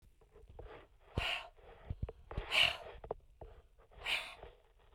{"exhalation_length": "4.9 s", "exhalation_amplitude": 4899, "exhalation_signal_mean_std_ratio": 0.42, "survey_phase": "beta (2021-08-13 to 2022-03-07)", "age": "45-64", "gender": "Female", "wearing_mask": "No", "symptom_none": true, "smoker_status": "Ex-smoker", "respiratory_condition_asthma": false, "respiratory_condition_other": false, "recruitment_source": "REACT", "submission_delay": "3 days", "covid_test_result": "Negative", "covid_test_method": "RT-qPCR"}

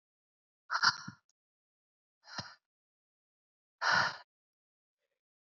{"exhalation_length": "5.5 s", "exhalation_amplitude": 7125, "exhalation_signal_mean_std_ratio": 0.25, "survey_phase": "beta (2021-08-13 to 2022-03-07)", "age": "18-44", "gender": "Female", "wearing_mask": "No", "symptom_cough_any": true, "symptom_runny_or_blocked_nose": true, "symptom_shortness_of_breath": true, "symptom_sore_throat": true, "symptom_diarrhoea": true, "symptom_fatigue": true, "symptom_fever_high_temperature": true, "symptom_headache": true, "symptom_change_to_sense_of_smell_or_taste": true, "smoker_status": "Never smoked", "respiratory_condition_asthma": false, "respiratory_condition_other": false, "recruitment_source": "Test and Trace", "submission_delay": "1 day", "covid_test_result": "Positive", "covid_test_method": "RT-qPCR", "covid_ct_value": 15.8, "covid_ct_gene": "ORF1ab gene", "covid_ct_mean": 16.2, "covid_viral_load": "4800000 copies/ml", "covid_viral_load_category": "High viral load (>1M copies/ml)"}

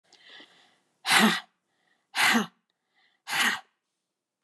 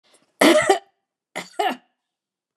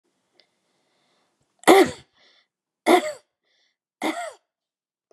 {"exhalation_length": "4.4 s", "exhalation_amplitude": 15372, "exhalation_signal_mean_std_ratio": 0.36, "cough_length": "2.6 s", "cough_amplitude": 28326, "cough_signal_mean_std_ratio": 0.35, "three_cough_length": "5.1 s", "three_cough_amplitude": 31371, "three_cough_signal_mean_std_ratio": 0.25, "survey_phase": "beta (2021-08-13 to 2022-03-07)", "age": "65+", "gender": "Female", "wearing_mask": "No", "symptom_cough_any": true, "symptom_runny_or_blocked_nose": true, "symptom_onset": "12 days", "smoker_status": "Ex-smoker", "respiratory_condition_asthma": false, "respiratory_condition_other": false, "recruitment_source": "REACT", "submission_delay": "2 days", "covid_test_result": "Negative", "covid_test_method": "RT-qPCR", "influenza_a_test_result": "Negative", "influenza_b_test_result": "Negative"}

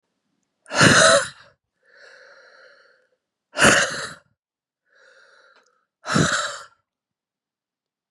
{"exhalation_length": "8.1 s", "exhalation_amplitude": 32424, "exhalation_signal_mean_std_ratio": 0.32, "survey_phase": "beta (2021-08-13 to 2022-03-07)", "age": "18-44", "gender": "Female", "wearing_mask": "No", "symptom_cough_any": true, "symptom_new_continuous_cough": true, "symptom_runny_or_blocked_nose": true, "symptom_shortness_of_breath": true, "symptom_diarrhoea": true, "symptom_fatigue": true, "symptom_headache": true, "symptom_onset": "4 days", "smoker_status": "Never smoked", "respiratory_condition_asthma": false, "respiratory_condition_other": false, "recruitment_source": "Test and Trace", "submission_delay": "2 days", "covid_test_result": "Positive", "covid_test_method": "RT-qPCR", "covid_ct_value": 20.4, "covid_ct_gene": "ORF1ab gene"}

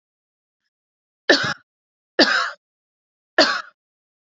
{"three_cough_length": "4.4 s", "three_cough_amplitude": 30019, "three_cough_signal_mean_std_ratio": 0.3, "survey_phase": "beta (2021-08-13 to 2022-03-07)", "age": "18-44", "gender": "Female", "wearing_mask": "No", "symptom_none": true, "smoker_status": "Current smoker (e-cigarettes or vapes only)", "respiratory_condition_asthma": true, "respiratory_condition_other": false, "recruitment_source": "Test and Trace", "submission_delay": "1 day", "covid_test_result": "Negative", "covid_test_method": "RT-qPCR"}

